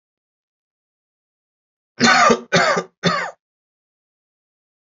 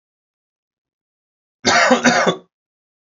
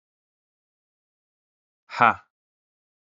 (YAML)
three_cough_length: 4.9 s
three_cough_amplitude: 26904
three_cough_signal_mean_std_ratio: 0.34
cough_length: 3.1 s
cough_amplitude: 32767
cough_signal_mean_std_ratio: 0.38
exhalation_length: 3.2 s
exhalation_amplitude: 26740
exhalation_signal_mean_std_ratio: 0.15
survey_phase: alpha (2021-03-01 to 2021-08-12)
age: 18-44
gender: Male
wearing_mask: 'No'
symptom_cough_any: true
symptom_diarrhoea: true
symptom_fatigue: true
symptom_fever_high_temperature: true
symptom_headache: true
symptom_change_to_sense_of_smell_or_taste: true
symptom_onset: 3 days
smoker_status: Ex-smoker
respiratory_condition_asthma: false
respiratory_condition_other: false
recruitment_source: Test and Trace
submission_delay: 2 days
covid_test_result: Positive
covid_test_method: RT-qPCR
covid_ct_value: 15.3
covid_ct_gene: N gene
covid_ct_mean: 15.5
covid_viral_load: 8300000 copies/ml
covid_viral_load_category: High viral load (>1M copies/ml)